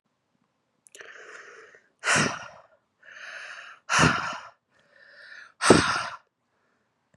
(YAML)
exhalation_length: 7.2 s
exhalation_amplitude: 29122
exhalation_signal_mean_std_ratio: 0.33
survey_phase: beta (2021-08-13 to 2022-03-07)
age: 18-44
gender: Female
wearing_mask: 'No'
symptom_runny_or_blocked_nose: true
symptom_shortness_of_breath: true
symptom_sore_throat: true
symptom_fatigue: true
symptom_headache: true
symptom_onset: 4 days
smoker_status: Never smoked
respiratory_condition_asthma: true
respiratory_condition_other: false
recruitment_source: Test and Trace
submission_delay: 1 day
covid_test_result: Positive
covid_test_method: RT-qPCR
covid_ct_value: 29.2
covid_ct_gene: ORF1ab gene
covid_ct_mean: 29.2
covid_viral_load: 260 copies/ml
covid_viral_load_category: Minimal viral load (< 10K copies/ml)